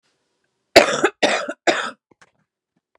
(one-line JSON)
{"three_cough_length": "3.0 s", "three_cough_amplitude": 32768, "three_cough_signal_mean_std_ratio": 0.33, "survey_phase": "beta (2021-08-13 to 2022-03-07)", "age": "18-44", "gender": "Female", "wearing_mask": "No", "symptom_cough_any": true, "symptom_runny_or_blocked_nose": true, "symptom_headache": true, "symptom_onset": "13 days", "smoker_status": "Current smoker (11 or more cigarettes per day)", "respiratory_condition_asthma": false, "respiratory_condition_other": false, "recruitment_source": "REACT", "submission_delay": "4 days", "covid_test_result": "Negative", "covid_test_method": "RT-qPCR", "influenza_a_test_result": "Negative", "influenza_b_test_result": "Negative"}